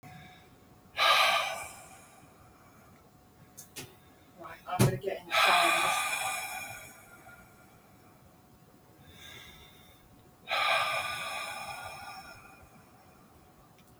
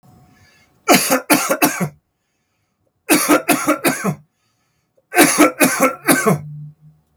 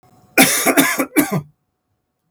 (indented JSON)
{
  "exhalation_length": "14.0 s",
  "exhalation_amplitude": 9445,
  "exhalation_signal_mean_std_ratio": 0.45,
  "three_cough_length": "7.2 s",
  "three_cough_amplitude": 32768,
  "three_cough_signal_mean_std_ratio": 0.5,
  "cough_length": "2.3 s",
  "cough_amplitude": 32768,
  "cough_signal_mean_std_ratio": 0.49,
  "survey_phase": "beta (2021-08-13 to 2022-03-07)",
  "age": "65+",
  "gender": "Male",
  "wearing_mask": "No",
  "symptom_cough_any": true,
  "symptom_fatigue": true,
  "smoker_status": "Ex-smoker",
  "respiratory_condition_asthma": false,
  "respiratory_condition_other": false,
  "recruitment_source": "Test and Trace",
  "submission_delay": "2 days",
  "covid_test_result": "Positive",
  "covid_test_method": "RT-qPCR",
  "covid_ct_value": 20.4,
  "covid_ct_gene": "ORF1ab gene"
}